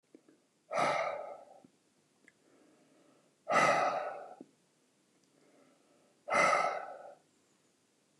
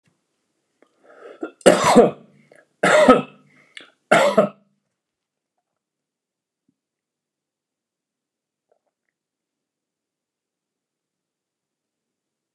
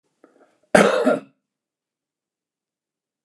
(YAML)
exhalation_length: 8.2 s
exhalation_amplitude: 5993
exhalation_signal_mean_std_ratio: 0.39
three_cough_length: 12.5 s
three_cough_amplitude: 29204
three_cough_signal_mean_std_ratio: 0.23
cough_length: 3.2 s
cough_amplitude: 29204
cough_signal_mean_std_ratio: 0.27
survey_phase: alpha (2021-03-01 to 2021-08-12)
age: 65+
gender: Male
wearing_mask: 'No'
symptom_none: true
smoker_status: Ex-smoker
respiratory_condition_asthma: false
respiratory_condition_other: false
recruitment_source: REACT
submission_delay: 1 day
covid_test_result: Negative
covid_test_method: RT-qPCR